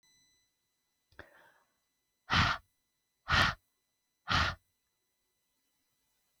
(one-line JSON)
{"exhalation_length": "6.4 s", "exhalation_amplitude": 8446, "exhalation_signal_mean_std_ratio": 0.28, "survey_phase": "beta (2021-08-13 to 2022-03-07)", "age": "45-64", "gender": "Female", "wearing_mask": "No", "symptom_none": true, "smoker_status": "Never smoked", "respiratory_condition_asthma": false, "respiratory_condition_other": false, "recruitment_source": "REACT", "submission_delay": "1 day", "covid_test_result": "Negative", "covid_test_method": "RT-qPCR", "influenza_a_test_result": "Negative", "influenza_b_test_result": "Negative"}